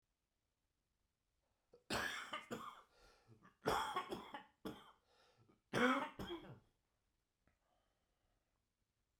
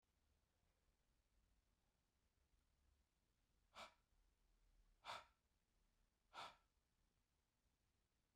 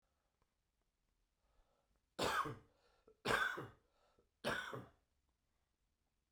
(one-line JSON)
{"cough_length": "9.2 s", "cough_amplitude": 2220, "cough_signal_mean_std_ratio": 0.34, "exhalation_length": "8.4 s", "exhalation_amplitude": 289, "exhalation_signal_mean_std_ratio": 0.31, "three_cough_length": "6.3 s", "three_cough_amplitude": 2281, "three_cough_signal_mean_std_ratio": 0.33, "survey_phase": "beta (2021-08-13 to 2022-03-07)", "age": "45-64", "gender": "Male", "wearing_mask": "No", "symptom_cough_any": true, "symptom_runny_or_blocked_nose": true, "symptom_fatigue": true, "symptom_fever_high_temperature": true, "symptom_headache": true, "symptom_onset": "2 days", "smoker_status": "Never smoked", "respiratory_condition_asthma": false, "respiratory_condition_other": false, "recruitment_source": "Test and Trace", "submission_delay": "1 day", "covid_test_result": "Positive", "covid_test_method": "RT-qPCR", "covid_ct_value": 13.8, "covid_ct_gene": "ORF1ab gene", "covid_ct_mean": 14.0, "covid_viral_load": "26000000 copies/ml", "covid_viral_load_category": "High viral load (>1M copies/ml)"}